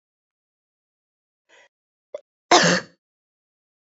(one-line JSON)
{"cough_length": "3.9 s", "cough_amplitude": 26891, "cough_signal_mean_std_ratio": 0.21, "survey_phase": "beta (2021-08-13 to 2022-03-07)", "age": "18-44", "gender": "Female", "wearing_mask": "No", "symptom_cough_any": true, "symptom_new_continuous_cough": true, "symptom_runny_or_blocked_nose": true, "symptom_shortness_of_breath": true, "symptom_fatigue": true, "symptom_headache": true, "symptom_onset": "2 days", "smoker_status": "Never smoked", "respiratory_condition_asthma": false, "respiratory_condition_other": false, "recruitment_source": "Test and Trace", "submission_delay": "1 day", "covid_test_result": "Positive", "covid_test_method": "RT-qPCR", "covid_ct_value": 19.9, "covid_ct_gene": "ORF1ab gene", "covid_ct_mean": 20.5, "covid_viral_load": "180000 copies/ml", "covid_viral_load_category": "Low viral load (10K-1M copies/ml)"}